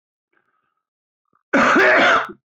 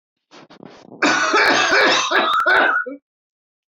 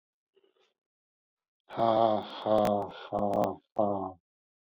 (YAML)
cough_length: 2.6 s
cough_amplitude: 21088
cough_signal_mean_std_ratio: 0.48
three_cough_length: 3.8 s
three_cough_amplitude: 23577
three_cough_signal_mean_std_ratio: 0.67
exhalation_length: 4.7 s
exhalation_amplitude: 9166
exhalation_signal_mean_std_ratio: 0.46
survey_phase: beta (2021-08-13 to 2022-03-07)
age: 45-64
gender: Male
wearing_mask: 'Yes'
symptom_cough_any: true
symptom_runny_or_blocked_nose: true
symptom_fatigue: true
symptom_headache: true
symptom_change_to_sense_of_smell_or_taste: true
symptom_loss_of_taste: true
symptom_onset: 5 days
smoker_status: Current smoker (e-cigarettes or vapes only)
respiratory_condition_asthma: false
respiratory_condition_other: false
recruitment_source: Test and Trace
submission_delay: 1 day
covid_test_result: Positive
covid_test_method: ePCR